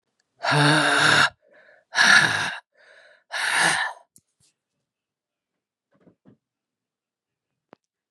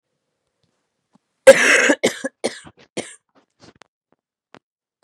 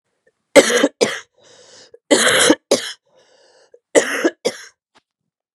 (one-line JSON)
{"exhalation_length": "8.1 s", "exhalation_amplitude": 26920, "exhalation_signal_mean_std_ratio": 0.4, "cough_length": "5.0 s", "cough_amplitude": 32768, "cough_signal_mean_std_ratio": 0.25, "three_cough_length": "5.5 s", "three_cough_amplitude": 32768, "three_cough_signal_mean_std_ratio": 0.37, "survey_phase": "beta (2021-08-13 to 2022-03-07)", "age": "45-64", "gender": "Female", "wearing_mask": "No", "symptom_cough_any": true, "symptom_runny_or_blocked_nose": true, "symptom_fatigue": true, "symptom_onset": "4 days", "smoker_status": "Ex-smoker", "respiratory_condition_asthma": false, "respiratory_condition_other": false, "recruitment_source": "Test and Trace", "submission_delay": "1 day", "covid_test_result": "Positive", "covid_test_method": "RT-qPCR", "covid_ct_value": 23.1, "covid_ct_gene": "ORF1ab gene"}